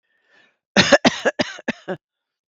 {
  "cough_length": "2.5 s",
  "cough_amplitude": 32768,
  "cough_signal_mean_std_ratio": 0.33,
  "survey_phase": "beta (2021-08-13 to 2022-03-07)",
  "age": "45-64",
  "gender": "Female",
  "wearing_mask": "No",
  "symptom_none": true,
  "smoker_status": "Never smoked",
  "respiratory_condition_asthma": false,
  "respiratory_condition_other": false,
  "recruitment_source": "REACT",
  "submission_delay": "1 day",
  "covid_test_result": "Negative",
  "covid_test_method": "RT-qPCR"
}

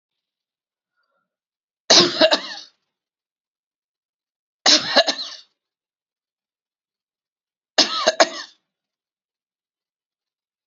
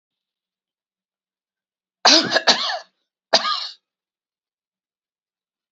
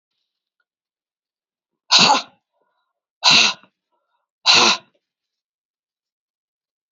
{
  "three_cough_length": "10.7 s",
  "three_cough_amplitude": 32664,
  "three_cough_signal_mean_std_ratio": 0.25,
  "cough_length": "5.7 s",
  "cough_amplitude": 32767,
  "cough_signal_mean_std_ratio": 0.28,
  "exhalation_length": "6.9 s",
  "exhalation_amplitude": 32463,
  "exhalation_signal_mean_std_ratio": 0.29,
  "survey_phase": "beta (2021-08-13 to 2022-03-07)",
  "age": "45-64",
  "gender": "Female",
  "wearing_mask": "No",
  "symptom_cough_any": true,
  "symptom_runny_or_blocked_nose": true,
  "symptom_shortness_of_breath": true,
  "symptom_other": true,
  "symptom_onset": "1 day",
  "smoker_status": "Never smoked",
  "respiratory_condition_asthma": false,
  "respiratory_condition_other": false,
  "recruitment_source": "Test and Trace",
  "submission_delay": "1 day",
  "covid_test_result": "Negative",
  "covid_test_method": "RT-qPCR"
}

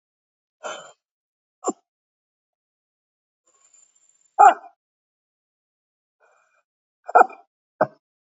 {
  "exhalation_length": "8.3 s",
  "exhalation_amplitude": 28025,
  "exhalation_signal_mean_std_ratio": 0.16,
  "survey_phase": "beta (2021-08-13 to 2022-03-07)",
  "age": "45-64",
  "gender": "Female",
  "wearing_mask": "No",
  "symptom_new_continuous_cough": true,
  "symptom_runny_or_blocked_nose": true,
  "symptom_shortness_of_breath": true,
  "symptom_sore_throat": true,
  "symptom_fatigue": true,
  "symptom_headache": true,
  "smoker_status": "Never smoked",
  "respiratory_condition_asthma": false,
  "respiratory_condition_other": false,
  "recruitment_source": "Test and Trace",
  "submission_delay": "0 days",
  "covid_test_result": "Positive",
  "covid_test_method": "RT-qPCR",
  "covid_ct_value": 22.6,
  "covid_ct_gene": "N gene"
}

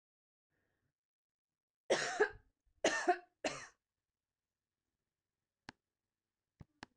{
  "three_cough_length": "7.0 s",
  "three_cough_amplitude": 3482,
  "three_cough_signal_mean_std_ratio": 0.25,
  "survey_phase": "beta (2021-08-13 to 2022-03-07)",
  "age": "45-64",
  "gender": "Female",
  "wearing_mask": "No",
  "symptom_none": true,
  "symptom_onset": "5 days",
  "smoker_status": "Never smoked",
  "respiratory_condition_asthma": false,
  "respiratory_condition_other": false,
  "recruitment_source": "REACT",
  "submission_delay": "1 day",
  "covid_test_result": "Negative",
  "covid_test_method": "RT-qPCR",
  "influenza_a_test_result": "Unknown/Void",
  "influenza_b_test_result": "Unknown/Void"
}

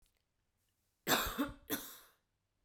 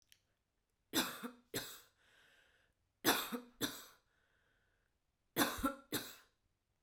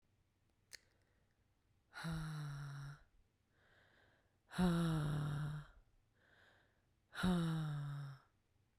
{
  "cough_length": "2.6 s",
  "cough_amplitude": 5387,
  "cough_signal_mean_std_ratio": 0.36,
  "three_cough_length": "6.8 s",
  "three_cough_amplitude": 4681,
  "three_cough_signal_mean_std_ratio": 0.34,
  "exhalation_length": "8.8 s",
  "exhalation_amplitude": 1956,
  "exhalation_signal_mean_std_ratio": 0.51,
  "survey_phase": "beta (2021-08-13 to 2022-03-07)",
  "age": "18-44",
  "gender": "Female",
  "wearing_mask": "No",
  "symptom_none": true,
  "smoker_status": "Never smoked",
  "respiratory_condition_asthma": false,
  "respiratory_condition_other": false,
  "recruitment_source": "REACT",
  "submission_delay": "5 days",
  "covid_test_result": "Negative",
  "covid_test_method": "RT-qPCR"
}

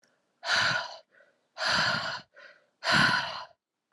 {
  "exhalation_length": "3.9 s",
  "exhalation_amplitude": 9025,
  "exhalation_signal_mean_std_ratio": 0.53,
  "survey_phase": "alpha (2021-03-01 to 2021-08-12)",
  "age": "18-44",
  "gender": "Female",
  "wearing_mask": "No",
  "symptom_cough_any": true,
  "symptom_new_continuous_cough": true,
  "symptom_shortness_of_breath": true,
  "symptom_fatigue": true,
  "symptom_fever_high_temperature": true,
  "symptom_headache": true,
  "symptom_change_to_sense_of_smell_or_taste": true,
  "symptom_loss_of_taste": true,
  "symptom_onset": "5 days",
  "smoker_status": "Never smoked",
  "respiratory_condition_asthma": false,
  "respiratory_condition_other": false,
  "recruitment_source": "Test and Trace",
  "submission_delay": "2 days",
  "covid_test_result": "Positive",
  "covid_test_method": "RT-qPCR",
  "covid_ct_value": 10.9,
  "covid_ct_gene": "N gene",
  "covid_ct_mean": 11.5,
  "covid_viral_load": "170000000 copies/ml",
  "covid_viral_load_category": "High viral load (>1M copies/ml)"
}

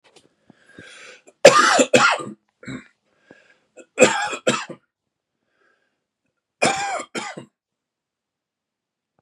{
  "three_cough_length": "9.2 s",
  "three_cough_amplitude": 32768,
  "three_cough_signal_mean_std_ratio": 0.3,
  "survey_phase": "beta (2021-08-13 to 2022-03-07)",
  "age": "45-64",
  "gender": "Male",
  "wearing_mask": "No",
  "symptom_cough_any": true,
  "symptom_runny_or_blocked_nose": true,
  "symptom_fever_high_temperature": true,
  "symptom_headache": true,
  "smoker_status": "Never smoked",
  "respiratory_condition_asthma": true,
  "respiratory_condition_other": false,
  "recruitment_source": "Test and Trace",
  "submission_delay": "2 days",
  "covid_test_result": "Positive",
  "covid_test_method": "LFT"
}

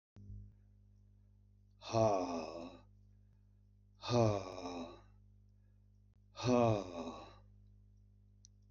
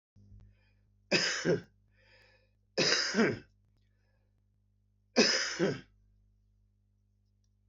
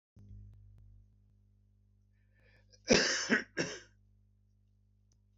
{
  "exhalation_length": "8.7 s",
  "exhalation_amplitude": 4032,
  "exhalation_signal_mean_std_ratio": 0.39,
  "three_cough_length": "7.7 s",
  "three_cough_amplitude": 9391,
  "three_cough_signal_mean_std_ratio": 0.37,
  "cough_length": "5.4 s",
  "cough_amplitude": 8451,
  "cough_signal_mean_std_ratio": 0.28,
  "survey_phase": "beta (2021-08-13 to 2022-03-07)",
  "age": "65+",
  "gender": "Male",
  "wearing_mask": "No",
  "symptom_cough_any": true,
  "symptom_runny_or_blocked_nose": true,
  "symptom_shortness_of_breath": true,
  "symptom_fatigue": true,
  "symptom_change_to_sense_of_smell_or_taste": true,
  "symptom_loss_of_taste": true,
  "symptom_onset": "8 days",
  "smoker_status": "Never smoked",
  "respiratory_condition_asthma": false,
  "respiratory_condition_other": true,
  "recruitment_source": "REACT",
  "submission_delay": "0 days",
  "covid_test_result": "Negative",
  "covid_test_method": "RT-qPCR"
}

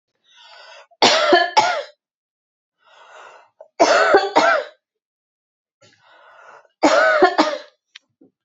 {
  "three_cough_length": "8.4 s",
  "three_cough_amplitude": 32768,
  "three_cough_signal_mean_std_ratio": 0.42,
  "survey_phase": "beta (2021-08-13 to 2022-03-07)",
  "age": "18-44",
  "gender": "Female",
  "wearing_mask": "Yes",
  "symptom_runny_or_blocked_nose": true,
  "symptom_fatigue": true,
  "symptom_headache": true,
  "symptom_change_to_sense_of_smell_or_taste": true,
  "symptom_loss_of_taste": true,
  "symptom_onset": "10 days",
  "smoker_status": "Ex-smoker",
  "respiratory_condition_asthma": false,
  "respiratory_condition_other": false,
  "recruitment_source": "Test and Trace",
  "submission_delay": "2 days",
  "covid_test_result": "Positive",
  "covid_test_method": "ePCR"
}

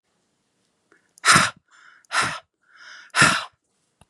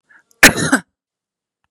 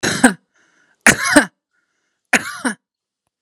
{
  "exhalation_length": "4.1 s",
  "exhalation_amplitude": 31431,
  "exhalation_signal_mean_std_ratio": 0.32,
  "cough_length": "1.7 s",
  "cough_amplitude": 32768,
  "cough_signal_mean_std_ratio": 0.28,
  "three_cough_length": "3.4 s",
  "three_cough_amplitude": 32768,
  "three_cough_signal_mean_std_ratio": 0.34,
  "survey_phase": "beta (2021-08-13 to 2022-03-07)",
  "age": "45-64",
  "gender": "Female",
  "wearing_mask": "No",
  "symptom_none": true,
  "smoker_status": "Ex-smoker",
  "respiratory_condition_asthma": false,
  "respiratory_condition_other": false,
  "recruitment_source": "REACT",
  "submission_delay": "1 day",
  "covid_test_result": "Negative",
  "covid_test_method": "RT-qPCR",
  "influenza_a_test_result": "Negative",
  "influenza_b_test_result": "Negative"
}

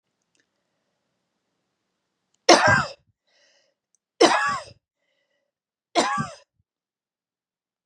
{
  "three_cough_length": "7.9 s",
  "three_cough_amplitude": 32183,
  "three_cough_signal_mean_std_ratio": 0.26,
  "survey_phase": "beta (2021-08-13 to 2022-03-07)",
  "age": "45-64",
  "gender": "Female",
  "wearing_mask": "No",
  "symptom_runny_or_blocked_nose": true,
  "smoker_status": "Never smoked",
  "respiratory_condition_asthma": false,
  "respiratory_condition_other": false,
  "recruitment_source": "Test and Trace",
  "submission_delay": "2 days",
  "covid_test_result": "Positive",
  "covid_test_method": "RT-qPCR",
  "covid_ct_value": 22.7,
  "covid_ct_gene": "ORF1ab gene",
  "covid_ct_mean": 23.5,
  "covid_viral_load": "20000 copies/ml",
  "covid_viral_load_category": "Low viral load (10K-1M copies/ml)"
}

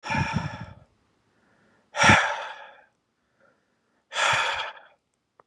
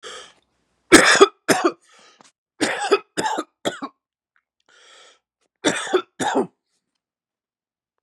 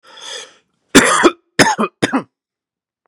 {
  "exhalation_length": "5.5 s",
  "exhalation_amplitude": 24211,
  "exhalation_signal_mean_std_ratio": 0.38,
  "three_cough_length": "8.0 s",
  "three_cough_amplitude": 32768,
  "three_cough_signal_mean_std_ratio": 0.32,
  "cough_length": "3.1 s",
  "cough_amplitude": 32768,
  "cough_signal_mean_std_ratio": 0.39,
  "survey_phase": "beta (2021-08-13 to 2022-03-07)",
  "age": "18-44",
  "gender": "Male",
  "wearing_mask": "No",
  "symptom_cough_any": true,
  "smoker_status": "Prefer not to say",
  "respiratory_condition_asthma": true,
  "respiratory_condition_other": false,
  "recruitment_source": "Test and Trace",
  "submission_delay": "1 day",
  "covid_test_result": "Negative",
  "covid_test_method": "RT-qPCR"
}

